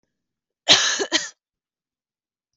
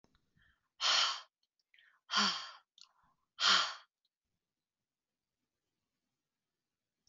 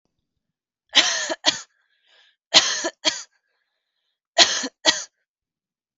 {"cough_length": "2.6 s", "cough_amplitude": 32768, "cough_signal_mean_std_ratio": 0.3, "exhalation_length": "7.1 s", "exhalation_amplitude": 5686, "exhalation_signal_mean_std_ratio": 0.29, "three_cough_length": "6.0 s", "three_cough_amplitude": 32768, "three_cough_signal_mean_std_ratio": 0.31, "survey_phase": "beta (2021-08-13 to 2022-03-07)", "age": "18-44", "gender": "Female", "wearing_mask": "No", "symptom_runny_or_blocked_nose": true, "smoker_status": "Never smoked", "respiratory_condition_asthma": false, "respiratory_condition_other": false, "recruitment_source": "REACT", "submission_delay": "1 day", "covid_test_result": "Negative", "covid_test_method": "RT-qPCR", "influenza_a_test_result": "Negative", "influenza_b_test_result": "Negative"}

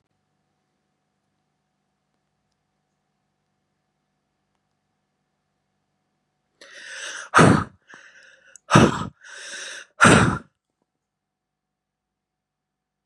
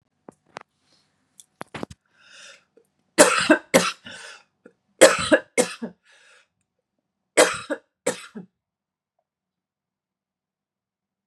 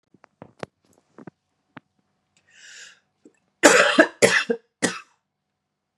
{"exhalation_length": "13.1 s", "exhalation_amplitude": 31826, "exhalation_signal_mean_std_ratio": 0.22, "three_cough_length": "11.3 s", "three_cough_amplitude": 32768, "three_cough_signal_mean_std_ratio": 0.24, "cough_length": "6.0 s", "cough_amplitude": 32767, "cough_signal_mean_std_ratio": 0.27, "survey_phase": "beta (2021-08-13 to 2022-03-07)", "age": "18-44", "gender": "Female", "wearing_mask": "No", "symptom_cough_any": true, "symptom_runny_or_blocked_nose": true, "symptom_fatigue": true, "symptom_headache": true, "smoker_status": "Current smoker (1 to 10 cigarettes per day)", "respiratory_condition_asthma": false, "respiratory_condition_other": false, "recruitment_source": "Test and Trace", "submission_delay": "1 day", "covid_test_result": "Positive", "covid_test_method": "RT-qPCR", "covid_ct_value": 27.4, "covid_ct_gene": "ORF1ab gene", "covid_ct_mean": 28.1, "covid_viral_load": "620 copies/ml", "covid_viral_load_category": "Minimal viral load (< 10K copies/ml)"}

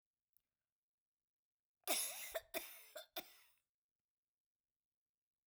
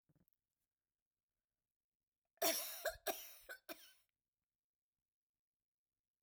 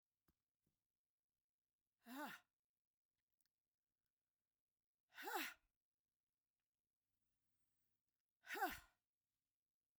{"cough_length": "5.5 s", "cough_amplitude": 1944, "cough_signal_mean_std_ratio": 0.28, "three_cough_length": "6.2 s", "three_cough_amplitude": 2171, "three_cough_signal_mean_std_ratio": 0.25, "exhalation_length": "10.0 s", "exhalation_amplitude": 817, "exhalation_signal_mean_std_ratio": 0.23, "survey_phase": "beta (2021-08-13 to 2022-03-07)", "age": "45-64", "gender": "Female", "wearing_mask": "No", "symptom_cough_any": true, "symptom_onset": "9 days", "smoker_status": "Never smoked", "respiratory_condition_asthma": false, "respiratory_condition_other": false, "recruitment_source": "REACT", "submission_delay": "3 days", "covid_test_result": "Positive", "covid_test_method": "RT-qPCR", "covid_ct_value": 25.0, "covid_ct_gene": "E gene"}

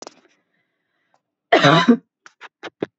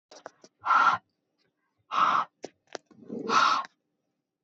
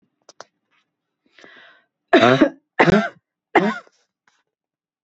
{"cough_length": "3.0 s", "cough_amplitude": 28242, "cough_signal_mean_std_ratio": 0.31, "exhalation_length": "4.4 s", "exhalation_amplitude": 11056, "exhalation_signal_mean_std_ratio": 0.42, "three_cough_length": "5.0 s", "three_cough_amplitude": 29861, "three_cough_signal_mean_std_ratio": 0.31, "survey_phase": "alpha (2021-03-01 to 2021-08-12)", "age": "45-64", "gender": "Female", "wearing_mask": "No", "symptom_none": true, "smoker_status": "Ex-smoker", "respiratory_condition_asthma": false, "respiratory_condition_other": false, "recruitment_source": "REACT", "submission_delay": "1 day", "covid_test_result": "Negative", "covid_test_method": "RT-qPCR"}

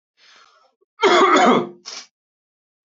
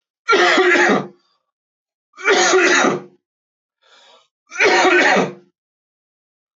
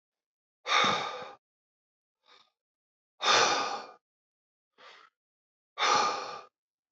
{"cough_length": "2.9 s", "cough_amplitude": 23434, "cough_signal_mean_std_ratio": 0.41, "three_cough_length": "6.6 s", "three_cough_amplitude": 26224, "three_cough_signal_mean_std_ratio": 0.52, "exhalation_length": "6.9 s", "exhalation_amplitude": 9509, "exhalation_signal_mean_std_ratio": 0.38, "survey_phase": "beta (2021-08-13 to 2022-03-07)", "age": "18-44", "gender": "Male", "wearing_mask": "No", "symptom_none": true, "smoker_status": "Never smoked", "respiratory_condition_asthma": false, "respiratory_condition_other": false, "recruitment_source": "REACT", "submission_delay": "1 day", "covid_test_result": "Negative", "covid_test_method": "RT-qPCR", "influenza_a_test_result": "Negative", "influenza_b_test_result": "Negative"}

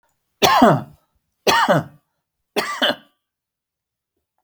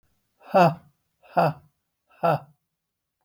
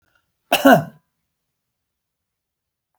{"three_cough_length": "4.4 s", "three_cough_amplitude": 32768, "three_cough_signal_mean_std_ratio": 0.38, "exhalation_length": "3.2 s", "exhalation_amplitude": 17166, "exhalation_signal_mean_std_ratio": 0.32, "cough_length": "3.0 s", "cough_amplitude": 32768, "cough_signal_mean_std_ratio": 0.22, "survey_phase": "beta (2021-08-13 to 2022-03-07)", "age": "65+", "gender": "Male", "wearing_mask": "No", "symptom_none": true, "smoker_status": "Never smoked", "respiratory_condition_asthma": false, "respiratory_condition_other": false, "recruitment_source": "REACT", "submission_delay": "2 days", "covid_test_result": "Negative", "covid_test_method": "RT-qPCR", "influenza_a_test_result": "Negative", "influenza_b_test_result": "Negative"}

